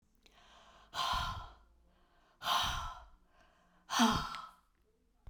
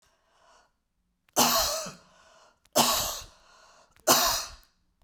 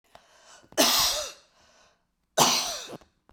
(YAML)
exhalation_length: 5.3 s
exhalation_amplitude: 5047
exhalation_signal_mean_std_ratio: 0.43
three_cough_length: 5.0 s
three_cough_amplitude: 15891
three_cough_signal_mean_std_ratio: 0.41
cough_length: 3.3 s
cough_amplitude: 18645
cough_signal_mean_std_ratio: 0.42
survey_phase: beta (2021-08-13 to 2022-03-07)
age: 65+
gender: Female
wearing_mask: 'No'
symptom_none: true
smoker_status: Never smoked
respiratory_condition_asthma: false
respiratory_condition_other: false
recruitment_source: REACT
submission_delay: 1 day
covid_test_result: Negative
covid_test_method: RT-qPCR